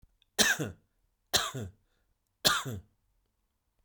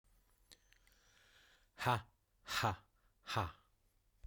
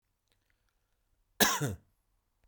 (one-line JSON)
{"three_cough_length": "3.8 s", "three_cough_amplitude": 12432, "three_cough_signal_mean_std_ratio": 0.34, "exhalation_length": "4.3 s", "exhalation_amplitude": 3097, "exhalation_signal_mean_std_ratio": 0.33, "cough_length": "2.5 s", "cough_amplitude": 13539, "cough_signal_mean_std_ratio": 0.26, "survey_phase": "beta (2021-08-13 to 2022-03-07)", "age": "45-64", "gender": "Male", "wearing_mask": "No", "symptom_none": true, "smoker_status": "Never smoked", "respiratory_condition_asthma": false, "respiratory_condition_other": false, "recruitment_source": "REACT", "submission_delay": "2 days", "covid_test_result": "Negative", "covid_test_method": "RT-qPCR"}